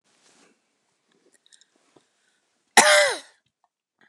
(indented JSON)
{
  "cough_length": "4.1 s",
  "cough_amplitude": 29203,
  "cough_signal_mean_std_ratio": 0.23,
  "survey_phase": "beta (2021-08-13 to 2022-03-07)",
  "age": "45-64",
  "gender": "Female",
  "wearing_mask": "No",
  "symptom_none": true,
  "smoker_status": "Ex-smoker",
  "respiratory_condition_asthma": false,
  "respiratory_condition_other": false,
  "recruitment_source": "Test and Trace",
  "submission_delay": "2 days",
  "covid_test_result": "Negative",
  "covid_test_method": "RT-qPCR"
}